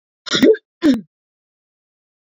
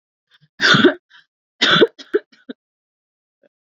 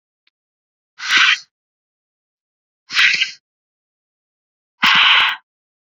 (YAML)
cough_length: 2.4 s
cough_amplitude: 26956
cough_signal_mean_std_ratio: 0.33
three_cough_length: 3.7 s
three_cough_amplitude: 29265
three_cough_signal_mean_std_ratio: 0.33
exhalation_length: 6.0 s
exhalation_amplitude: 31401
exhalation_signal_mean_std_ratio: 0.36
survey_phase: beta (2021-08-13 to 2022-03-07)
age: 18-44
gender: Female
wearing_mask: 'No'
symptom_cough_any: true
symptom_shortness_of_breath: true
symptom_sore_throat: true
symptom_fatigue: true
symptom_headache: true
symptom_onset: 3 days
smoker_status: Ex-smoker
respiratory_condition_asthma: false
respiratory_condition_other: false
recruitment_source: Test and Trace
submission_delay: 1 day
covid_test_result: Positive
covid_test_method: RT-qPCR